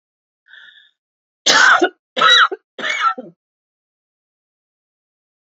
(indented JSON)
{
  "three_cough_length": "5.5 s",
  "three_cough_amplitude": 32768,
  "three_cough_signal_mean_std_ratio": 0.35,
  "survey_phase": "alpha (2021-03-01 to 2021-08-12)",
  "age": "45-64",
  "gender": "Female",
  "wearing_mask": "No",
  "symptom_cough_any": true,
  "symptom_shortness_of_breath": true,
  "symptom_fatigue": true,
  "symptom_onset": "4 days",
  "smoker_status": "Never smoked",
  "respiratory_condition_asthma": false,
  "respiratory_condition_other": false,
  "recruitment_source": "Test and Trace",
  "submission_delay": "2 days",
  "covid_test_result": "Positive",
  "covid_test_method": "RT-qPCR",
  "covid_ct_value": 30.3,
  "covid_ct_gene": "N gene",
  "covid_ct_mean": 30.9,
  "covid_viral_load": "72 copies/ml",
  "covid_viral_load_category": "Minimal viral load (< 10K copies/ml)"
}